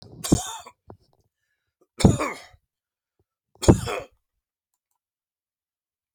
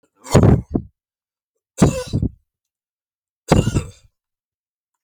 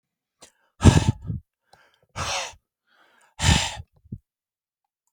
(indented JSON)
{
  "cough_length": "6.1 s",
  "cough_amplitude": 30868,
  "cough_signal_mean_std_ratio": 0.22,
  "three_cough_length": "5.0 s",
  "three_cough_amplitude": 31273,
  "three_cough_signal_mean_std_ratio": 0.33,
  "exhalation_length": "5.1 s",
  "exhalation_amplitude": 28572,
  "exhalation_signal_mean_std_ratio": 0.28,
  "survey_phase": "alpha (2021-03-01 to 2021-08-12)",
  "age": "65+",
  "gender": "Male",
  "wearing_mask": "No",
  "symptom_none": true,
  "smoker_status": "Never smoked",
  "respiratory_condition_asthma": false,
  "respiratory_condition_other": false,
  "recruitment_source": "REACT",
  "submission_delay": "1 day",
  "covid_test_result": "Negative",
  "covid_test_method": "RT-qPCR"
}